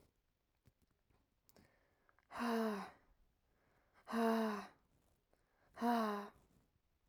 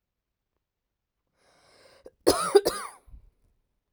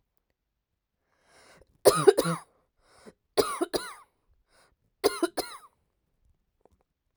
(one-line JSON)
{"exhalation_length": "7.1 s", "exhalation_amplitude": 1840, "exhalation_signal_mean_std_ratio": 0.38, "cough_length": "3.9 s", "cough_amplitude": 19718, "cough_signal_mean_std_ratio": 0.23, "three_cough_length": "7.2 s", "three_cough_amplitude": 21895, "three_cough_signal_mean_std_ratio": 0.24, "survey_phase": "alpha (2021-03-01 to 2021-08-12)", "age": "18-44", "gender": "Female", "wearing_mask": "No", "symptom_none": true, "smoker_status": "Never smoked", "respiratory_condition_asthma": false, "respiratory_condition_other": false, "recruitment_source": "REACT", "submission_delay": "1 day", "covid_test_result": "Negative", "covid_test_method": "RT-qPCR"}